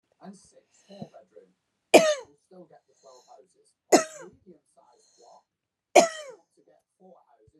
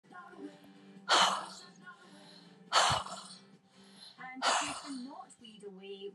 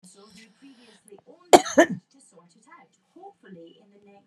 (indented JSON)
{
  "three_cough_length": "7.6 s",
  "three_cough_amplitude": 27815,
  "three_cough_signal_mean_std_ratio": 0.2,
  "exhalation_length": "6.1 s",
  "exhalation_amplitude": 7038,
  "exhalation_signal_mean_std_ratio": 0.44,
  "cough_length": "4.3 s",
  "cough_amplitude": 32767,
  "cough_signal_mean_std_ratio": 0.18,
  "survey_phase": "beta (2021-08-13 to 2022-03-07)",
  "age": "65+",
  "gender": "Female",
  "wearing_mask": "No",
  "symptom_shortness_of_breath": true,
  "symptom_fatigue": true,
  "symptom_headache": true,
  "smoker_status": "Ex-smoker",
  "respiratory_condition_asthma": false,
  "respiratory_condition_other": false,
  "recruitment_source": "Test and Trace",
  "submission_delay": "2 days",
  "covid_test_result": "Positive",
  "covid_test_method": "RT-qPCR"
}